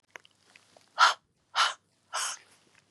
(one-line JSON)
{"exhalation_length": "2.9 s", "exhalation_amplitude": 13760, "exhalation_signal_mean_std_ratio": 0.3, "survey_phase": "beta (2021-08-13 to 2022-03-07)", "age": "45-64", "gender": "Female", "wearing_mask": "No", "symptom_runny_or_blocked_nose": true, "symptom_sore_throat": true, "symptom_fatigue": true, "symptom_headache": true, "symptom_change_to_sense_of_smell_or_taste": true, "smoker_status": "Ex-smoker", "respiratory_condition_asthma": false, "respiratory_condition_other": false, "recruitment_source": "Test and Trace", "submission_delay": "2 days", "covid_test_result": "Positive", "covid_test_method": "RT-qPCR", "covid_ct_value": 22.6, "covid_ct_gene": "ORF1ab gene", "covid_ct_mean": 23.3, "covid_viral_load": "22000 copies/ml", "covid_viral_load_category": "Low viral load (10K-1M copies/ml)"}